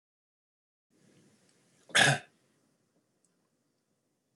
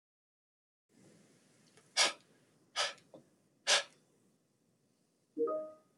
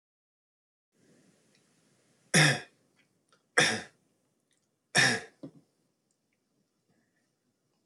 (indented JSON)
{
  "cough_length": "4.4 s",
  "cough_amplitude": 11019,
  "cough_signal_mean_std_ratio": 0.19,
  "exhalation_length": "6.0 s",
  "exhalation_amplitude": 5607,
  "exhalation_signal_mean_std_ratio": 0.29,
  "three_cough_length": "7.9 s",
  "three_cough_amplitude": 18493,
  "three_cough_signal_mean_std_ratio": 0.24,
  "survey_phase": "alpha (2021-03-01 to 2021-08-12)",
  "age": "18-44",
  "gender": "Male",
  "wearing_mask": "No",
  "symptom_none": true,
  "smoker_status": "Never smoked",
  "respiratory_condition_asthma": false,
  "respiratory_condition_other": false,
  "recruitment_source": "REACT",
  "submission_delay": "1 day",
  "covid_test_result": "Negative",
  "covid_test_method": "RT-qPCR"
}